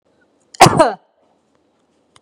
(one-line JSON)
{"cough_length": "2.2 s", "cough_amplitude": 32768, "cough_signal_mean_std_ratio": 0.27, "survey_phase": "beta (2021-08-13 to 2022-03-07)", "age": "18-44", "gender": "Female", "wearing_mask": "No", "symptom_none": true, "smoker_status": "Never smoked", "respiratory_condition_asthma": false, "respiratory_condition_other": false, "recruitment_source": "REACT", "submission_delay": "1 day", "covid_test_result": "Negative", "covid_test_method": "RT-qPCR"}